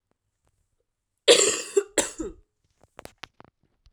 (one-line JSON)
{"cough_length": "3.9 s", "cough_amplitude": 24100, "cough_signal_mean_std_ratio": 0.27, "survey_phase": "alpha (2021-03-01 to 2021-08-12)", "age": "18-44", "gender": "Female", "wearing_mask": "No", "symptom_cough_any": true, "symptom_fatigue": true, "symptom_onset": "3 days", "smoker_status": "Current smoker (e-cigarettes or vapes only)", "respiratory_condition_asthma": true, "respiratory_condition_other": false, "recruitment_source": "Test and Trace", "submission_delay": "2 days", "covid_test_result": "Positive", "covid_test_method": "RT-qPCR", "covid_ct_value": 16.4, "covid_ct_gene": "ORF1ab gene", "covid_ct_mean": 17.0, "covid_viral_load": "2800000 copies/ml", "covid_viral_load_category": "High viral load (>1M copies/ml)"}